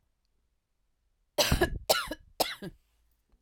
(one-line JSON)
{"three_cough_length": "3.4 s", "three_cough_amplitude": 11688, "three_cough_signal_mean_std_ratio": 0.34, "survey_phase": "alpha (2021-03-01 to 2021-08-12)", "age": "45-64", "gender": "Female", "wearing_mask": "No", "symptom_none": true, "smoker_status": "Ex-smoker", "respiratory_condition_asthma": false, "respiratory_condition_other": false, "recruitment_source": "REACT", "submission_delay": "1 day", "covid_test_result": "Negative", "covid_test_method": "RT-qPCR"}